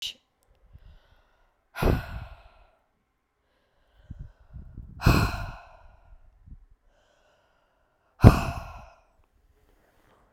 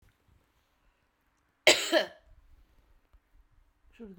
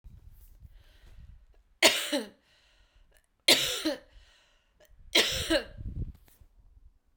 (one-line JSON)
{"exhalation_length": "10.3 s", "exhalation_amplitude": 32768, "exhalation_signal_mean_std_ratio": 0.22, "cough_length": "4.2 s", "cough_amplitude": 18872, "cough_signal_mean_std_ratio": 0.22, "three_cough_length": "7.2 s", "three_cough_amplitude": 17843, "three_cough_signal_mean_std_ratio": 0.34, "survey_phase": "beta (2021-08-13 to 2022-03-07)", "age": "45-64", "gender": "Female", "wearing_mask": "No", "symptom_cough_any": true, "symptom_runny_or_blocked_nose": true, "symptom_sore_throat": true, "symptom_fatigue": true, "symptom_other": true, "smoker_status": "Ex-smoker", "respiratory_condition_asthma": false, "respiratory_condition_other": false, "recruitment_source": "Test and Trace", "submission_delay": "2 days", "covid_test_result": "Positive", "covid_test_method": "RT-qPCR"}